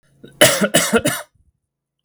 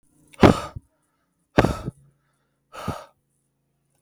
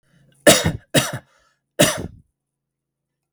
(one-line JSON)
{"cough_length": "2.0 s", "cough_amplitude": 32768, "cough_signal_mean_std_ratio": 0.44, "exhalation_length": "4.0 s", "exhalation_amplitude": 32768, "exhalation_signal_mean_std_ratio": 0.22, "three_cough_length": "3.3 s", "three_cough_amplitude": 32768, "three_cough_signal_mean_std_ratio": 0.31, "survey_phase": "beta (2021-08-13 to 2022-03-07)", "age": "45-64", "gender": "Male", "wearing_mask": "No", "symptom_none": true, "smoker_status": "Never smoked", "respiratory_condition_asthma": false, "respiratory_condition_other": false, "recruitment_source": "REACT", "submission_delay": "1 day", "covid_test_result": "Negative", "covid_test_method": "RT-qPCR"}